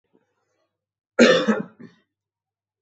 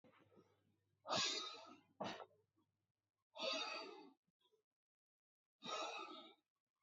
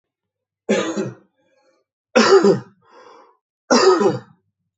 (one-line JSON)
{"cough_length": "2.8 s", "cough_amplitude": 27081, "cough_signal_mean_std_ratio": 0.29, "exhalation_length": "6.8 s", "exhalation_amplitude": 1170, "exhalation_signal_mean_std_ratio": 0.43, "three_cough_length": "4.8 s", "three_cough_amplitude": 28145, "three_cough_signal_mean_std_ratio": 0.41, "survey_phase": "beta (2021-08-13 to 2022-03-07)", "age": "45-64", "gender": "Male", "wearing_mask": "No", "symptom_none": true, "symptom_onset": "11 days", "smoker_status": "Ex-smoker", "respiratory_condition_asthma": false, "respiratory_condition_other": false, "recruitment_source": "REACT", "submission_delay": "2 days", "covid_test_result": "Negative", "covid_test_method": "RT-qPCR", "influenza_a_test_result": "Negative", "influenza_b_test_result": "Negative"}